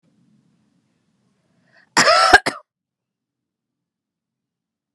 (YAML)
cough_length: 4.9 s
cough_amplitude: 32768
cough_signal_mean_std_ratio: 0.23
survey_phase: beta (2021-08-13 to 2022-03-07)
age: 18-44
gender: Female
wearing_mask: 'No'
symptom_runny_or_blocked_nose: true
symptom_fatigue: true
symptom_headache: true
symptom_change_to_sense_of_smell_or_taste: true
symptom_onset: 5 days
smoker_status: Never smoked
respiratory_condition_asthma: false
respiratory_condition_other: false
recruitment_source: Test and Trace
submission_delay: 2 days
covid_test_result: Positive
covid_test_method: RT-qPCR